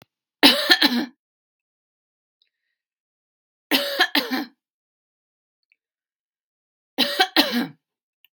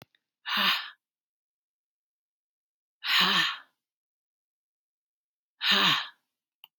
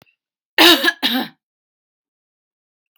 {"three_cough_length": "8.4 s", "three_cough_amplitude": 32768, "three_cough_signal_mean_std_ratio": 0.31, "exhalation_length": "6.8 s", "exhalation_amplitude": 10949, "exhalation_signal_mean_std_ratio": 0.35, "cough_length": "3.0 s", "cough_amplitude": 32767, "cough_signal_mean_std_ratio": 0.31, "survey_phase": "beta (2021-08-13 to 2022-03-07)", "age": "45-64", "gender": "Female", "wearing_mask": "No", "symptom_none": true, "symptom_onset": "5 days", "smoker_status": "Ex-smoker", "respiratory_condition_asthma": false, "respiratory_condition_other": false, "recruitment_source": "REACT", "submission_delay": "3 days", "covid_test_result": "Negative", "covid_test_method": "RT-qPCR", "influenza_a_test_result": "Unknown/Void", "influenza_b_test_result": "Unknown/Void"}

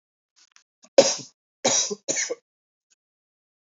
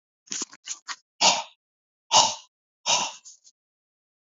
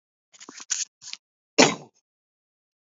{"three_cough_length": "3.7 s", "three_cough_amplitude": 28242, "three_cough_signal_mean_std_ratio": 0.28, "exhalation_length": "4.4 s", "exhalation_amplitude": 24981, "exhalation_signal_mean_std_ratio": 0.32, "cough_length": "2.9 s", "cough_amplitude": 28767, "cough_signal_mean_std_ratio": 0.21, "survey_phase": "beta (2021-08-13 to 2022-03-07)", "age": "45-64", "gender": "Male", "wearing_mask": "No", "symptom_runny_or_blocked_nose": true, "symptom_sore_throat": true, "symptom_fatigue": true, "symptom_headache": true, "symptom_onset": "12 days", "smoker_status": "Ex-smoker", "respiratory_condition_asthma": false, "respiratory_condition_other": false, "recruitment_source": "REACT", "submission_delay": "1 day", "covid_test_result": "Negative", "covid_test_method": "RT-qPCR"}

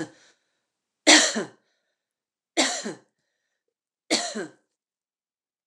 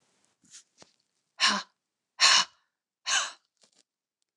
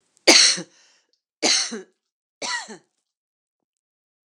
{"three_cough_length": "5.7 s", "three_cough_amplitude": 27191, "three_cough_signal_mean_std_ratio": 0.27, "exhalation_length": "4.4 s", "exhalation_amplitude": 15127, "exhalation_signal_mean_std_ratio": 0.29, "cough_length": "4.3 s", "cough_amplitude": 29204, "cough_signal_mean_std_ratio": 0.3, "survey_phase": "beta (2021-08-13 to 2022-03-07)", "age": "45-64", "gender": "Female", "wearing_mask": "No", "symptom_none": true, "smoker_status": "Never smoked", "respiratory_condition_asthma": false, "respiratory_condition_other": false, "recruitment_source": "REACT", "submission_delay": "1 day", "covid_test_result": "Negative", "covid_test_method": "RT-qPCR"}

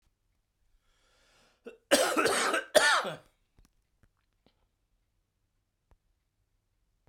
{"three_cough_length": "7.1 s", "three_cough_amplitude": 15455, "three_cough_signal_mean_std_ratio": 0.3, "survey_phase": "beta (2021-08-13 to 2022-03-07)", "age": "65+", "gender": "Male", "wearing_mask": "No", "symptom_cough_any": true, "symptom_runny_or_blocked_nose": true, "symptom_shortness_of_breath": true, "symptom_sore_throat": true, "symptom_diarrhoea": true, "symptom_other": true, "symptom_onset": "8 days", "smoker_status": "Ex-smoker", "respiratory_condition_asthma": false, "respiratory_condition_other": false, "recruitment_source": "Test and Trace", "submission_delay": "2 days", "covid_test_result": "Positive", "covid_test_method": "RT-qPCR", "covid_ct_value": 18.4, "covid_ct_gene": "ORF1ab gene", "covid_ct_mean": 18.6, "covid_viral_load": "790000 copies/ml", "covid_viral_load_category": "Low viral load (10K-1M copies/ml)"}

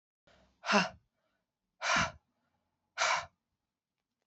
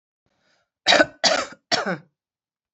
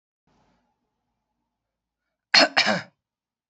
{"exhalation_length": "4.3 s", "exhalation_amplitude": 7737, "exhalation_signal_mean_std_ratio": 0.33, "three_cough_length": "2.7 s", "three_cough_amplitude": 26443, "three_cough_signal_mean_std_ratio": 0.35, "cough_length": "3.5 s", "cough_amplitude": 26992, "cough_signal_mean_std_ratio": 0.23, "survey_phase": "beta (2021-08-13 to 2022-03-07)", "age": "45-64", "gender": "Female", "wearing_mask": "No", "symptom_cough_any": true, "symptom_runny_or_blocked_nose": true, "symptom_fatigue": true, "symptom_headache": true, "symptom_change_to_sense_of_smell_or_taste": true, "symptom_loss_of_taste": true, "symptom_other": true, "symptom_onset": "8 days", "smoker_status": "Current smoker (e-cigarettes or vapes only)", "respiratory_condition_asthma": false, "respiratory_condition_other": false, "recruitment_source": "Test and Trace", "submission_delay": "2 days", "covid_test_result": "Positive", "covid_test_method": "RT-qPCR"}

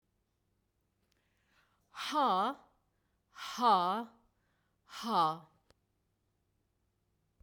{"exhalation_length": "7.4 s", "exhalation_amplitude": 5385, "exhalation_signal_mean_std_ratio": 0.35, "survey_phase": "beta (2021-08-13 to 2022-03-07)", "age": "45-64", "gender": "Female", "wearing_mask": "No", "symptom_none": true, "smoker_status": "Never smoked", "respiratory_condition_asthma": false, "respiratory_condition_other": false, "recruitment_source": "REACT", "submission_delay": "2 days", "covid_test_result": "Negative", "covid_test_method": "RT-qPCR", "influenza_a_test_result": "Negative", "influenza_b_test_result": "Negative"}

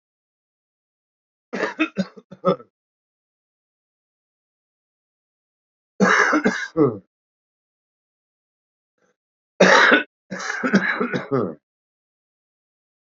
{"three_cough_length": "13.1 s", "three_cough_amplitude": 27315, "three_cough_signal_mean_std_ratio": 0.33, "survey_phase": "alpha (2021-03-01 to 2021-08-12)", "age": "45-64", "gender": "Male", "wearing_mask": "No", "symptom_cough_any": true, "symptom_onset": "5 days", "smoker_status": "Current smoker (1 to 10 cigarettes per day)", "respiratory_condition_asthma": true, "respiratory_condition_other": true, "recruitment_source": "Test and Trace", "submission_delay": "2 days", "covid_test_result": "Positive", "covid_test_method": "RT-qPCR"}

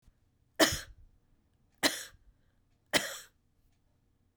{"three_cough_length": "4.4 s", "three_cough_amplitude": 13324, "three_cough_signal_mean_std_ratio": 0.25, "survey_phase": "beta (2021-08-13 to 2022-03-07)", "age": "65+", "gender": "Female", "wearing_mask": "No", "symptom_none": true, "smoker_status": "Never smoked", "respiratory_condition_asthma": false, "respiratory_condition_other": false, "recruitment_source": "REACT", "submission_delay": "4 days", "covid_test_result": "Negative", "covid_test_method": "RT-qPCR", "influenza_a_test_result": "Negative", "influenza_b_test_result": "Negative"}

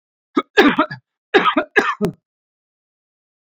{"three_cough_length": "3.5 s", "three_cough_amplitude": 28241, "three_cough_signal_mean_std_ratio": 0.37, "survey_phase": "beta (2021-08-13 to 2022-03-07)", "age": "45-64", "gender": "Male", "wearing_mask": "No", "symptom_none": true, "smoker_status": "Current smoker (11 or more cigarettes per day)", "respiratory_condition_asthma": false, "respiratory_condition_other": false, "recruitment_source": "REACT", "submission_delay": "1 day", "covid_test_result": "Negative", "covid_test_method": "RT-qPCR"}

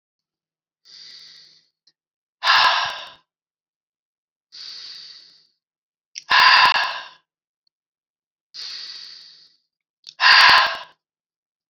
{"exhalation_length": "11.7 s", "exhalation_amplitude": 30783, "exhalation_signal_mean_std_ratio": 0.32, "survey_phase": "beta (2021-08-13 to 2022-03-07)", "age": "45-64", "gender": "Female", "wearing_mask": "No", "symptom_none": true, "smoker_status": "Ex-smoker", "respiratory_condition_asthma": true, "respiratory_condition_other": false, "recruitment_source": "Test and Trace", "submission_delay": "-2 days", "covid_test_result": "Negative", "covid_test_method": "RT-qPCR"}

